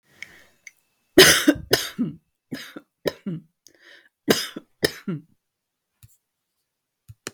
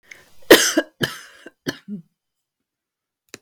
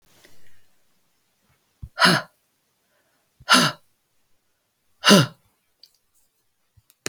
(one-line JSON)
{"three_cough_length": "7.3 s", "three_cough_amplitude": 32768, "three_cough_signal_mean_std_ratio": 0.26, "cough_length": "3.4 s", "cough_amplitude": 32768, "cough_signal_mean_std_ratio": 0.25, "exhalation_length": "7.1 s", "exhalation_amplitude": 32766, "exhalation_signal_mean_std_ratio": 0.25, "survey_phase": "beta (2021-08-13 to 2022-03-07)", "age": "45-64", "gender": "Female", "wearing_mask": "No", "symptom_cough_any": true, "smoker_status": "Never smoked", "respiratory_condition_asthma": false, "respiratory_condition_other": false, "recruitment_source": "REACT", "submission_delay": "2 days", "covid_test_result": "Negative", "covid_test_method": "RT-qPCR"}